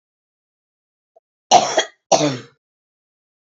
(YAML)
cough_length: 3.4 s
cough_amplitude: 32449
cough_signal_mean_std_ratio: 0.29
survey_phase: alpha (2021-03-01 to 2021-08-12)
age: 45-64
gender: Female
wearing_mask: 'No'
symptom_none: true
smoker_status: Current smoker (1 to 10 cigarettes per day)
respiratory_condition_asthma: false
respiratory_condition_other: false
recruitment_source: REACT
submission_delay: 1 day
covid_test_result: Negative
covid_test_method: RT-qPCR